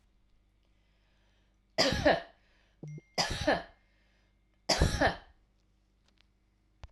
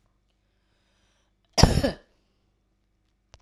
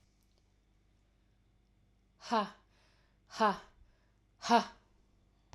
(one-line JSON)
{"three_cough_length": "6.9 s", "three_cough_amplitude": 8682, "three_cough_signal_mean_std_ratio": 0.34, "cough_length": "3.4 s", "cough_amplitude": 29237, "cough_signal_mean_std_ratio": 0.2, "exhalation_length": "5.5 s", "exhalation_amplitude": 6583, "exhalation_signal_mean_std_ratio": 0.25, "survey_phase": "alpha (2021-03-01 to 2021-08-12)", "age": "45-64", "gender": "Female", "wearing_mask": "No", "symptom_none": true, "smoker_status": "Never smoked", "respiratory_condition_asthma": false, "respiratory_condition_other": false, "recruitment_source": "REACT", "submission_delay": "2 days", "covid_test_result": "Negative", "covid_test_method": "RT-qPCR"}